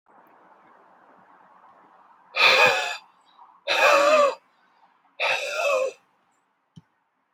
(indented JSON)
{
  "exhalation_length": "7.3 s",
  "exhalation_amplitude": 21143,
  "exhalation_signal_mean_std_ratio": 0.42,
  "survey_phase": "beta (2021-08-13 to 2022-03-07)",
  "age": "18-44",
  "gender": "Male",
  "wearing_mask": "No",
  "symptom_sore_throat": true,
  "symptom_fatigue": true,
  "symptom_headache": true,
  "smoker_status": "Current smoker (e-cigarettes or vapes only)",
  "respiratory_condition_asthma": false,
  "respiratory_condition_other": false,
  "recruitment_source": "REACT",
  "submission_delay": "2 days",
  "covid_test_result": "Negative",
  "covid_test_method": "RT-qPCR"
}